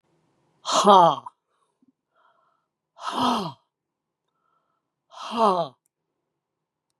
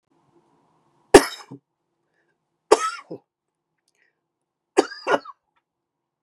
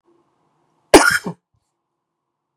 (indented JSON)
{
  "exhalation_length": "7.0 s",
  "exhalation_amplitude": 27831,
  "exhalation_signal_mean_std_ratio": 0.3,
  "three_cough_length": "6.2 s",
  "three_cough_amplitude": 32768,
  "three_cough_signal_mean_std_ratio": 0.18,
  "cough_length": "2.6 s",
  "cough_amplitude": 32768,
  "cough_signal_mean_std_ratio": 0.23,
  "survey_phase": "beta (2021-08-13 to 2022-03-07)",
  "age": "65+",
  "gender": "Male",
  "wearing_mask": "No",
  "symptom_cough_any": true,
  "smoker_status": "Ex-smoker",
  "respiratory_condition_asthma": true,
  "respiratory_condition_other": false,
  "recruitment_source": "REACT",
  "submission_delay": "1 day",
  "covid_test_result": "Negative",
  "covid_test_method": "RT-qPCR",
  "influenza_a_test_result": "Unknown/Void",
  "influenza_b_test_result": "Unknown/Void"
}